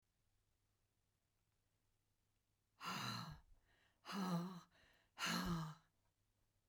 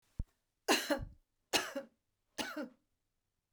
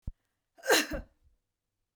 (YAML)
exhalation_length: 6.7 s
exhalation_amplitude: 1031
exhalation_signal_mean_std_ratio: 0.43
three_cough_length: 3.5 s
three_cough_amplitude: 5247
three_cough_signal_mean_std_ratio: 0.35
cough_length: 2.0 s
cough_amplitude: 8831
cough_signal_mean_std_ratio: 0.3
survey_phase: beta (2021-08-13 to 2022-03-07)
age: 65+
gender: Female
wearing_mask: 'No'
symptom_none: true
smoker_status: Never smoked
respiratory_condition_asthma: false
respiratory_condition_other: false
recruitment_source: REACT
submission_delay: 7 days
covid_test_result: Negative
covid_test_method: RT-qPCR